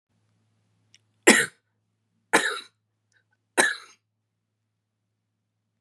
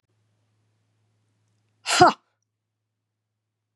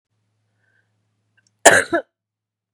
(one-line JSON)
{"three_cough_length": "5.8 s", "three_cough_amplitude": 28432, "three_cough_signal_mean_std_ratio": 0.22, "exhalation_length": "3.8 s", "exhalation_amplitude": 30533, "exhalation_signal_mean_std_ratio": 0.18, "cough_length": "2.7 s", "cough_amplitude": 32768, "cough_signal_mean_std_ratio": 0.22, "survey_phase": "beta (2021-08-13 to 2022-03-07)", "age": "45-64", "gender": "Female", "wearing_mask": "No", "symptom_shortness_of_breath": true, "symptom_sore_throat": true, "symptom_onset": "5 days", "smoker_status": "Never smoked", "respiratory_condition_asthma": true, "respiratory_condition_other": false, "recruitment_source": "Test and Trace", "submission_delay": "3 days", "covid_test_result": "Negative", "covid_test_method": "RT-qPCR"}